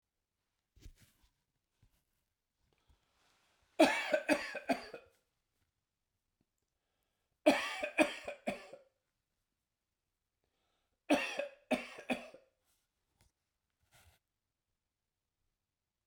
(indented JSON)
{
  "three_cough_length": "16.1 s",
  "three_cough_amplitude": 7435,
  "three_cough_signal_mean_std_ratio": 0.24,
  "survey_phase": "beta (2021-08-13 to 2022-03-07)",
  "age": "65+",
  "gender": "Male",
  "wearing_mask": "No",
  "symptom_cough_any": true,
  "symptom_fatigue": true,
  "symptom_change_to_sense_of_smell_or_taste": true,
  "symptom_other": true,
  "symptom_onset": "5 days",
  "smoker_status": "Never smoked",
  "respiratory_condition_asthma": false,
  "respiratory_condition_other": false,
  "recruitment_source": "Test and Trace",
  "submission_delay": "3 days",
  "covid_test_result": "Positive",
  "covid_test_method": "RT-qPCR",
  "covid_ct_value": 21.5,
  "covid_ct_gene": "ORF1ab gene",
  "covid_ct_mean": 22.3,
  "covid_viral_load": "48000 copies/ml",
  "covid_viral_load_category": "Low viral load (10K-1M copies/ml)"
}